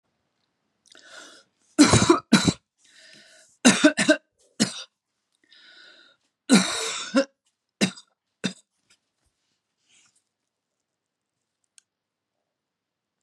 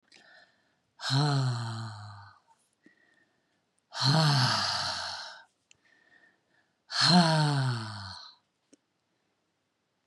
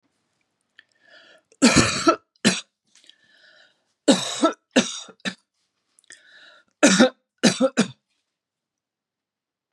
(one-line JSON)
{"three_cough_length": "13.2 s", "three_cough_amplitude": 29519, "three_cough_signal_mean_std_ratio": 0.27, "exhalation_length": "10.1 s", "exhalation_amplitude": 12293, "exhalation_signal_mean_std_ratio": 0.47, "cough_length": "9.7 s", "cough_amplitude": 30454, "cough_signal_mean_std_ratio": 0.32, "survey_phase": "beta (2021-08-13 to 2022-03-07)", "age": "45-64", "gender": "Female", "wearing_mask": "No", "symptom_none": true, "smoker_status": "Ex-smoker", "respiratory_condition_asthma": false, "respiratory_condition_other": false, "recruitment_source": "REACT", "submission_delay": "3 days", "covid_test_result": "Negative", "covid_test_method": "RT-qPCR", "influenza_a_test_result": "Negative", "influenza_b_test_result": "Negative"}